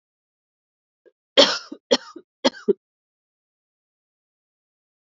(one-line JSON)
{"three_cough_length": "5.0 s", "three_cough_amplitude": 28246, "three_cough_signal_mean_std_ratio": 0.2, "survey_phase": "alpha (2021-03-01 to 2021-08-12)", "age": "18-44", "gender": "Female", "wearing_mask": "No", "symptom_cough_any": true, "symptom_new_continuous_cough": true, "symptom_shortness_of_breath": true, "symptom_fatigue": true, "symptom_fever_high_temperature": true, "symptom_headache": true, "symptom_change_to_sense_of_smell_or_taste": true, "symptom_loss_of_taste": true, "symptom_onset": "3 days", "smoker_status": "Current smoker (e-cigarettes or vapes only)", "respiratory_condition_asthma": false, "respiratory_condition_other": false, "recruitment_source": "Test and Trace", "submission_delay": "1 day", "covid_test_result": "Positive", "covid_test_method": "RT-qPCR"}